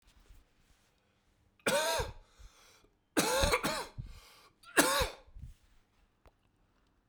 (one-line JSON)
{"three_cough_length": "7.1 s", "three_cough_amplitude": 12073, "three_cough_signal_mean_std_ratio": 0.38, "survey_phase": "beta (2021-08-13 to 2022-03-07)", "age": "18-44", "gender": "Male", "wearing_mask": "No", "symptom_cough_any": true, "symptom_runny_or_blocked_nose": true, "symptom_fatigue": true, "symptom_other": true, "symptom_onset": "6 days", "smoker_status": "Never smoked", "respiratory_condition_asthma": false, "respiratory_condition_other": false, "recruitment_source": "Test and Trace", "submission_delay": "1 day", "covid_test_result": "Positive", "covid_test_method": "RT-qPCR", "covid_ct_value": 20.3, "covid_ct_gene": "N gene"}